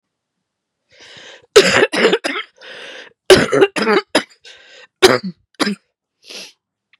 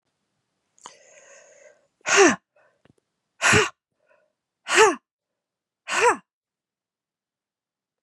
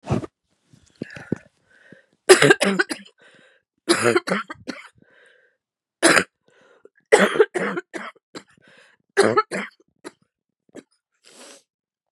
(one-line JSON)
{"cough_length": "7.0 s", "cough_amplitude": 32768, "cough_signal_mean_std_ratio": 0.38, "exhalation_length": "8.0 s", "exhalation_amplitude": 25704, "exhalation_signal_mean_std_ratio": 0.28, "three_cough_length": "12.1 s", "three_cough_amplitude": 32768, "three_cough_signal_mean_std_ratio": 0.31, "survey_phase": "beta (2021-08-13 to 2022-03-07)", "age": "45-64", "gender": "Female", "wearing_mask": "No", "symptom_cough_any": true, "symptom_fatigue": true, "symptom_fever_high_temperature": true, "symptom_headache": true, "symptom_change_to_sense_of_smell_or_taste": true, "symptom_loss_of_taste": true, "symptom_onset": "7 days", "smoker_status": "Ex-smoker", "respiratory_condition_asthma": false, "respiratory_condition_other": false, "recruitment_source": "Test and Trace", "submission_delay": "2 days", "covid_test_result": "Positive", "covid_test_method": "RT-qPCR", "covid_ct_value": 19.6, "covid_ct_gene": "ORF1ab gene", "covid_ct_mean": 20.0, "covid_viral_load": "270000 copies/ml", "covid_viral_load_category": "Low viral load (10K-1M copies/ml)"}